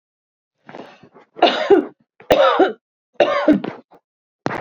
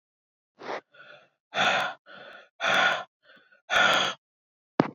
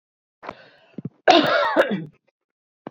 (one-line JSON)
{"three_cough_length": "4.6 s", "three_cough_amplitude": 27724, "three_cough_signal_mean_std_ratio": 0.43, "exhalation_length": "4.9 s", "exhalation_amplitude": 26291, "exhalation_signal_mean_std_ratio": 0.43, "cough_length": "2.9 s", "cough_amplitude": 27339, "cough_signal_mean_std_ratio": 0.39, "survey_phase": "beta (2021-08-13 to 2022-03-07)", "age": "45-64", "gender": "Female", "wearing_mask": "No", "symptom_none": true, "smoker_status": "Ex-smoker", "respiratory_condition_asthma": false, "respiratory_condition_other": false, "recruitment_source": "REACT", "submission_delay": "3 days", "covid_test_result": "Negative", "covid_test_method": "RT-qPCR", "influenza_a_test_result": "Negative", "influenza_b_test_result": "Negative"}